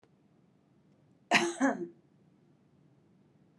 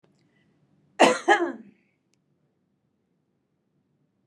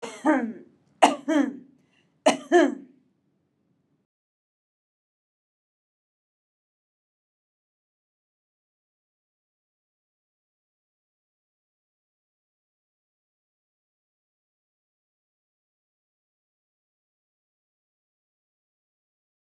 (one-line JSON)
{"exhalation_length": "3.6 s", "exhalation_amplitude": 11105, "exhalation_signal_mean_std_ratio": 0.29, "cough_length": "4.3 s", "cough_amplitude": 26869, "cough_signal_mean_std_ratio": 0.23, "three_cough_length": "19.5 s", "three_cough_amplitude": 25268, "three_cough_signal_mean_std_ratio": 0.17, "survey_phase": "beta (2021-08-13 to 2022-03-07)", "age": "45-64", "gender": "Female", "wearing_mask": "No", "symptom_none": true, "smoker_status": "Current smoker (1 to 10 cigarettes per day)", "respiratory_condition_asthma": false, "respiratory_condition_other": false, "recruitment_source": "REACT", "submission_delay": "1 day", "covid_test_result": "Negative", "covid_test_method": "RT-qPCR"}